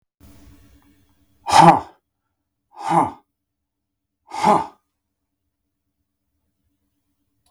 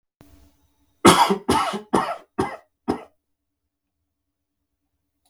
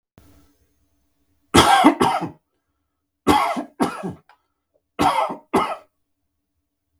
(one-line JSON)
{"exhalation_length": "7.5 s", "exhalation_amplitude": 32768, "exhalation_signal_mean_std_ratio": 0.24, "cough_length": "5.3 s", "cough_amplitude": 32768, "cough_signal_mean_std_ratio": 0.3, "three_cough_length": "7.0 s", "three_cough_amplitude": 32768, "three_cough_signal_mean_std_ratio": 0.38, "survey_phase": "beta (2021-08-13 to 2022-03-07)", "age": "45-64", "gender": "Male", "wearing_mask": "No", "symptom_sore_throat": true, "symptom_fatigue": true, "symptom_headache": true, "smoker_status": "Never smoked", "respiratory_condition_asthma": false, "respiratory_condition_other": false, "recruitment_source": "Test and Trace", "submission_delay": "1 day", "covid_test_result": "Positive", "covid_test_method": "RT-qPCR"}